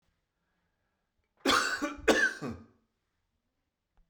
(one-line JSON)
{"cough_length": "4.1 s", "cough_amplitude": 10112, "cough_signal_mean_std_ratio": 0.35, "survey_phase": "beta (2021-08-13 to 2022-03-07)", "age": "65+", "gender": "Male", "wearing_mask": "No", "symptom_none": true, "smoker_status": "Ex-smoker", "respiratory_condition_asthma": false, "respiratory_condition_other": false, "recruitment_source": "REACT", "submission_delay": "2 days", "covid_test_result": "Negative", "covid_test_method": "RT-qPCR"}